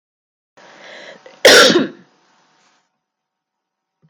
{"cough_length": "4.1 s", "cough_amplitude": 32768, "cough_signal_mean_std_ratio": 0.28, "survey_phase": "beta (2021-08-13 to 2022-03-07)", "age": "45-64", "gender": "Female", "wearing_mask": "No", "symptom_runny_or_blocked_nose": true, "symptom_onset": "12 days", "smoker_status": "Never smoked", "respiratory_condition_asthma": false, "respiratory_condition_other": false, "recruitment_source": "REACT", "submission_delay": "1 day", "covid_test_result": "Negative", "covid_test_method": "RT-qPCR"}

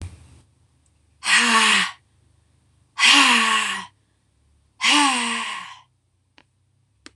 {"exhalation_length": "7.2 s", "exhalation_amplitude": 24679, "exhalation_signal_mean_std_ratio": 0.46, "survey_phase": "beta (2021-08-13 to 2022-03-07)", "age": "65+", "gender": "Female", "wearing_mask": "No", "symptom_none": true, "smoker_status": "Never smoked", "respiratory_condition_asthma": true, "respiratory_condition_other": false, "recruitment_source": "REACT", "submission_delay": "1 day", "covid_test_result": "Negative", "covid_test_method": "RT-qPCR", "influenza_a_test_result": "Negative", "influenza_b_test_result": "Negative"}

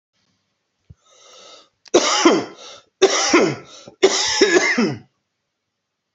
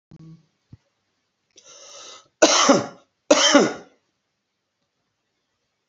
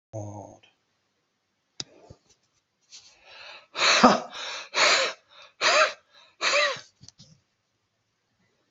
{"three_cough_length": "6.1 s", "three_cough_amplitude": 30914, "three_cough_signal_mean_std_ratio": 0.46, "cough_length": "5.9 s", "cough_amplitude": 32767, "cough_signal_mean_std_ratio": 0.3, "exhalation_length": "8.7 s", "exhalation_amplitude": 27614, "exhalation_signal_mean_std_ratio": 0.35, "survey_phase": "beta (2021-08-13 to 2022-03-07)", "age": "45-64", "gender": "Male", "wearing_mask": "No", "symptom_none": true, "smoker_status": "Never smoked", "respiratory_condition_asthma": true, "respiratory_condition_other": false, "recruitment_source": "REACT", "submission_delay": "2 days", "covid_test_result": "Negative", "covid_test_method": "RT-qPCR"}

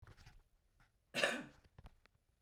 {"cough_length": "2.4 s", "cough_amplitude": 4403, "cough_signal_mean_std_ratio": 0.31, "survey_phase": "beta (2021-08-13 to 2022-03-07)", "age": "18-44", "gender": "Female", "wearing_mask": "No", "symptom_none": true, "smoker_status": "Current smoker (1 to 10 cigarettes per day)", "respiratory_condition_asthma": false, "respiratory_condition_other": false, "recruitment_source": "REACT", "submission_delay": "2 days", "covid_test_result": "Negative", "covid_test_method": "RT-qPCR"}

